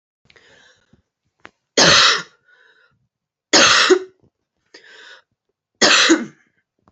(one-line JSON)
{"three_cough_length": "6.9 s", "three_cough_amplitude": 32767, "three_cough_signal_mean_std_ratio": 0.36, "survey_phase": "beta (2021-08-13 to 2022-03-07)", "age": "18-44", "gender": "Female", "wearing_mask": "No", "symptom_cough_any": true, "symptom_runny_or_blocked_nose": true, "symptom_diarrhoea": true, "symptom_fatigue": true, "symptom_headache": true, "symptom_change_to_sense_of_smell_or_taste": true, "symptom_onset": "2 days", "smoker_status": "Never smoked", "respiratory_condition_asthma": false, "respiratory_condition_other": false, "recruitment_source": "Test and Trace", "submission_delay": "1 day", "covid_test_result": "Positive", "covid_test_method": "RT-qPCR"}